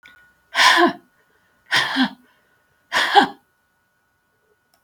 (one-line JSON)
{"exhalation_length": "4.8 s", "exhalation_amplitude": 32704, "exhalation_signal_mean_std_ratio": 0.37, "survey_phase": "beta (2021-08-13 to 2022-03-07)", "age": "65+", "gender": "Female", "wearing_mask": "No", "symptom_sore_throat": true, "symptom_onset": "12 days", "smoker_status": "Ex-smoker", "respiratory_condition_asthma": false, "respiratory_condition_other": false, "recruitment_source": "REACT", "submission_delay": "3 days", "covid_test_result": "Negative", "covid_test_method": "RT-qPCR"}